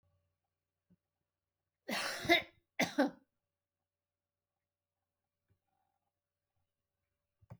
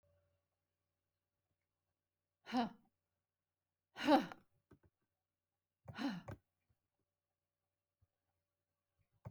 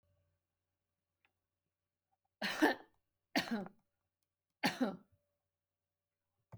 {"cough_length": "7.6 s", "cough_amplitude": 6631, "cough_signal_mean_std_ratio": 0.21, "exhalation_length": "9.3 s", "exhalation_amplitude": 3215, "exhalation_signal_mean_std_ratio": 0.2, "three_cough_length": "6.6 s", "three_cough_amplitude": 4650, "three_cough_signal_mean_std_ratio": 0.26, "survey_phase": "alpha (2021-03-01 to 2021-08-12)", "age": "65+", "gender": "Female", "wearing_mask": "No", "symptom_none": true, "smoker_status": "Ex-smoker", "respiratory_condition_asthma": false, "respiratory_condition_other": false, "recruitment_source": "REACT", "submission_delay": "1 day", "covid_test_method": "RT-qPCR"}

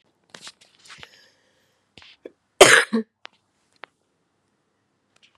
{"cough_length": "5.4 s", "cough_amplitude": 32768, "cough_signal_mean_std_ratio": 0.18, "survey_phase": "beta (2021-08-13 to 2022-03-07)", "age": "18-44", "gender": "Female", "wearing_mask": "No", "symptom_cough_any": true, "symptom_new_continuous_cough": true, "symptom_shortness_of_breath": true, "symptom_fatigue": true, "symptom_headache": true, "symptom_change_to_sense_of_smell_or_taste": true, "symptom_loss_of_taste": true, "symptom_onset": "7 days", "smoker_status": "Never smoked", "respiratory_condition_asthma": false, "respiratory_condition_other": false, "recruitment_source": "Test and Trace", "submission_delay": "2 days", "covid_test_result": "Positive", "covid_test_method": "RT-qPCR"}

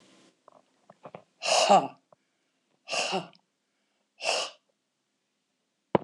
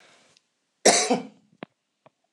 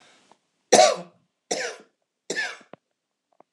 {"exhalation_length": "6.0 s", "exhalation_amplitude": 15260, "exhalation_signal_mean_std_ratio": 0.3, "cough_length": "2.3 s", "cough_amplitude": 23867, "cough_signal_mean_std_ratio": 0.29, "three_cough_length": "3.5 s", "three_cough_amplitude": 26028, "three_cough_signal_mean_std_ratio": 0.28, "survey_phase": "beta (2021-08-13 to 2022-03-07)", "age": "45-64", "gender": "Female", "wearing_mask": "No", "symptom_none": true, "smoker_status": "Ex-smoker", "respiratory_condition_asthma": false, "respiratory_condition_other": false, "recruitment_source": "REACT", "submission_delay": "1 day", "covid_test_result": "Negative", "covid_test_method": "RT-qPCR"}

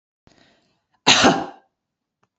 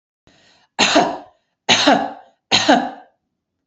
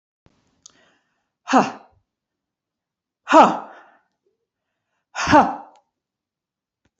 {"cough_length": "2.4 s", "cough_amplitude": 30455, "cough_signal_mean_std_ratio": 0.3, "three_cough_length": "3.7 s", "three_cough_amplitude": 32767, "three_cough_signal_mean_std_ratio": 0.44, "exhalation_length": "7.0 s", "exhalation_amplitude": 28694, "exhalation_signal_mean_std_ratio": 0.25, "survey_phase": "beta (2021-08-13 to 2022-03-07)", "age": "45-64", "gender": "Female", "wearing_mask": "No", "symptom_none": true, "smoker_status": "Never smoked", "respiratory_condition_asthma": false, "respiratory_condition_other": false, "recruitment_source": "REACT", "submission_delay": "2 days", "covid_test_result": "Negative", "covid_test_method": "RT-qPCR", "influenza_a_test_result": "Negative", "influenza_b_test_result": "Negative"}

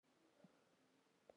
{"cough_length": "1.4 s", "cough_amplitude": 141, "cough_signal_mean_std_ratio": 0.68, "survey_phase": "beta (2021-08-13 to 2022-03-07)", "age": "18-44", "gender": "Female", "wearing_mask": "No", "symptom_new_continuous_cough": true, "symptom_runny_or_blocked_nose": true, "symptom_shortness_of_breath": true, "symptom_sore_throat": true, "symptom_headache": true, "symptom_other": true, "smoker_status": "Ex-smoker", "respiratory_condition_asthma": false, "respiratory_condition_other": false, "recruitment_source": "Test and Trace", "submission_delay": "1 day", "covid_test_result": "Positive", "covid_test_method": "LFT"}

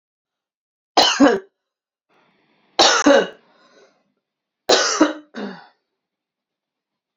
{"three_cough_length": "7.2 s", "three_cough_amplitude": 32099, "three_cough_signal_mean_std_ratio": 0.33, "survey_phase": "beta (2021-08-13 to 2022-03-07)", "age": "45-64", "gender": "Female", "wearing_mask": "No", "symptom_none": true, "smoker_status": "Never smoked", "respiratory_condition_asthma": false, "respiratory_condition_other": false, "recruitment_source": "REACT", "submission_delay": "2 days", "covid_test_result": "Negative", "covid_test_method": "RT-qPCR", "influenza_a_test_result": "Unknown/Void", "influenza_b_test_result": "Unknown/Void"}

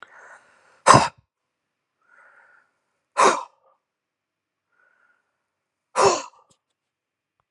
{"exhalation_length": "7.5 s", "exhalation_amplitude": 32768, "exhalation_signal_mean_std_ratio": 0.22, "survey_phase": "alpha (2021-03-01 to 2021-08-12)", "age": "45-64", "gender": "Male", "wearing_mask": "No", "symptom_cough_any": true, "symptom_fatigue": true, "smoker_status": "Ex-smoker", "respiratory_condition_asthma": false, "respiratory_condition_other": false, "recruitment_source": "Test and Trace", "submission_delay": "1 day", "covid_test_result": "Positive", "covid_test_method": "LFT"}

